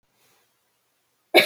{"cough_length": "1.5 s", "cough_amplitude": 29650, "cough_signal_mean_std_ratio": 0.2, "survey_phase": "beta (2021-08-13 to 2022-03-07)", "age": "65+", "gender": "Female", "wearing_mask": "No", "symptom_none": true, "symptom_onset": "12 days", "smoker_status": "Ex-smoker", "respiratory_condition_asthma": false, "respiratory_condition_other": false, "recruitment_source": "REACT", "submission_delay": "2 days", "covid_test_result": "Negative", "covid_test_method": "RT-qPCR"}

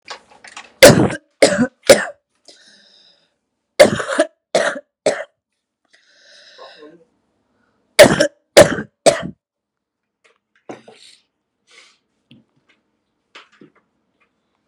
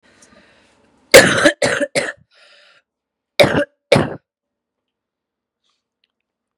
{"three_cough_length": "14.7 s", "three_cough_amplitude": 32768, "three_cough_signal_mean_std_ratio": 0.26, "cough_length": "6.6 s", "cough_amplitude": 32768, "cough_signal_mean_std_ratio": 0.29, "survey_phase": "beta (2021-08-13 to 2022-03-07)", "age": "18-44", "gender": "Female", "wearing_mask": "No", "symptom_cough_any": true, "symptom_runny_or_blocked_nose": true, "symptom_sore_throat": true, "symptom_abdominal_pain": true, "symptom_diarrhoea": true, "symptom_fatigue": true, "symptom_fever_high_temperature": true, "symptom_headache": true, "symptom_change_to_sense_of_smell_or_taste": true, "smoker_status": "Current smoker (1 to 10 cigarettes per day)", "respiratory_condition_asthma": false, "respiratory_condition_other": false, "recruitment_source": "Test and Trace", "submission_delay": "1 day", "covid_test_result": "Positive", "covid_test_method": "RT-qPCR", "covid_ct_value": 28.1, "covid_ct_gene": "ORF1ab gene", "covid_ct_mean": 28.4, "covid_viral_load": "470 copies/ml", "covid_viral_load_category": "Minimal viral load (< 10K copies/ml)"}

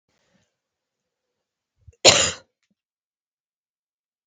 {"cough_length": "4.3 s", "cough_amplitude": 32768, "cough_signal_mean_std_ratio": 0.17, "survey_phase": "beta (2021-08-13 to 2022-03-07)", "age": "18-44", "gender": "Female", "wearing_mask": "No", "symptom_cough_any": true, "symptom_runny_or_blocked_nose": true, "symptom_sore_throat": true, "symptom_fatigue": true, "symptom_fever_high_temperature": true, "symptom_onset": "3 days", "smoker_status": "Never smoked", "respiratory_condition_asthma": false, "respiratory_condition_other": false, "recruitment_source": "Test and Trace", "submission_delay": "1 day", "covid_test_result": "Positive", "covid_test_method": "RT-qPCR", "covid_ct_value": 15.0, "covid_ct_gene": "ORF1ab gene"}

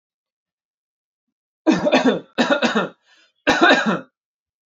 {"three_cough_length": "4.7 s", "three_cough_amplitude": 27253, "three_cough_signal_mean_std_ratio": 0.44, "survey_phase": "alpha (2021-03-01 to 2021-08-12)", "age": "18-44", "gender": "Male", "wearing_mask": "No", "symptom_none": true, "smoker_status": "Never smoked", "respiratory_condition_asthma": false, "respiratory_condition_other": false, "recruitment_source": "REACT", "submission_delay": "1 day", "covid_test_result": "Negative", "covid_test_method": "RT-qPCR"}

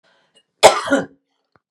{"cough_length": "1.7 s", "cough_amplitude": 32768, "cough_signal_mean_std_ratio": 0.3, "survey_phase": "beta (2021-08-13 to 2022-03-07)", "age": "45-64", "gender": "Female", "wearing_mask": "No", "symptom_none": true, "smoker_status": "Never smoked", "respiratory_condition_asthma": false, "respiratory_condition_other": false, "recruitment_source": "REACT", "submission_delay": "2 days", "covid_test_result": "Negative", "covid_test_method": "RT-qPCR"}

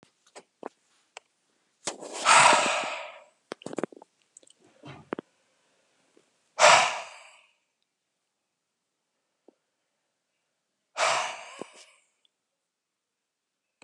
{"exhalation_length": "13.8 s", "exhalation_amplitude": 23177, "exhalation_signal_mean_std_ratio": 0.26, "survey_phase": "beta (2021-08-13 to 2022-03-07)", "age": "65+", "gender": "Male", "wearing_mask": "Yes", "symptom_cough_any": true, "symptom_runny_or_blocked_nose": true, "symptom_fatigue": true, "symptom_onset": "4 days", "smoker_status": "Never smoked", "respiratory_condition_asthma": false, "respiratory_condition_other": false, "recruitment_source": "Test and Trace", "submission_delay": "2 days", "covid_test_result": "Positive", "covid_test_method": "ePCR"}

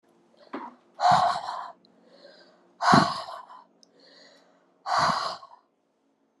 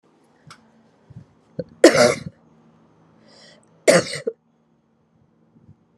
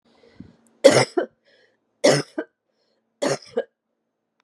{"exhalation_length": "6.4 s", "exhalation_amplitude": 18650, "exhalation_signal_mean_std_ratio": 0.38, "cough_length": "6.0 s", "cough_amplitude": 32768, "cough_signal_mean_std_ratio": 0.24, "three_cough_length": "4.4 s", "three_cough_amplitude": 32767, "three_cough_signal_mean_std_ratio": 0.28, "survey_phase": "beta (2021-08-13 to 2022-03-07)", "age": "45-64", "gender": "Female", "wearing_mask": "No", "symptom_runny_or_blocked_nose": true, "symptom_fatigue": true, "symptom_change_to_sense_of_smell_or_taste": true, "symptom_loss_of_taste": true, "symptom_onset": "4 days", "smoker_status": "Ex-smoker", "respiratory_condition_asthma": false, "respiratory_condition_other": false, "recruitment_source": "Test and Trace", "submission_delay": "2 days", "covid_test_result": "Positive", "covid_test_method": "RT-qPCR", "covid_ct_value": 19.6, "covid_ct_gene": "N gene", "covid_ct_mean": 20.2, "covid_viral_load": "230000 copies/ml", "covid_viral_load_category": "Low viral load (10K-1M copies/ml)"}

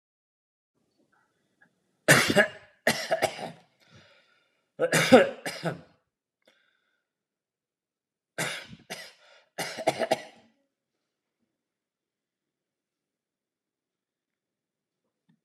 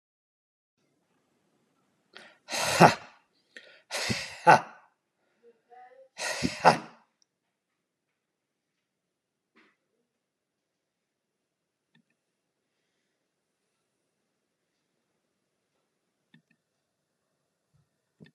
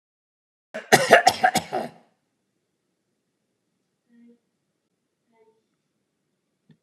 {"three_cough_length": "15.4 s", "three_cough_amplitude": 26214, "three_cough_signal_mean_std_ratio": 0.24, "exhalation_length": "18.3 s", "exhalation_amplitude": 27288, "exhalation_signal_mean_std_ratio": 0.16, "cough_length": "6.8 s", "cough_amplitude": 32726, "cough_signal_mean_std_ratio": 0.21, "survey_phase": "alpha (2021-03-01 to 2021-08-12)", "age": "65+", "gender": "Male", "wearing_mask": "No", "symptom_cough_any": true, "smoker_status": "Ex-smoker", "respiratory_condition_asthma": false, "respiratory_condition_other": false, "recruitment_source": "REACT", "submission_delay": "2 days", "covid_test_result": "Negative", "covid_test_method": "RT-qPCR"}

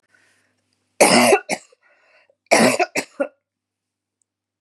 {"cough_length": "4.6 s", "cough_amplitude": 32767, "cough_signal_mean_std_ratio": 0.34, "survey_phase": "beta (2021-08-13 to 2022-03-07)", "age": "45-64", "gender": "Female", "wearing_mask": "No", "symptom_cough_any": true, "symptom_runny_or_blocked_nose": true, "symptom_sore_throat": true, "symptom_headache": true, "symptom_other": true, "symptom_onset": "2 days", "smoker_status": "Never smoked", "respiratory_condition_asthma": false, "respiratory_condition_other": false, "recruitment_source": "Test and Trace", "submission_delay": "1 day", "covid_test_result": "Negative", "covid_test_method": "RT-qPCR"}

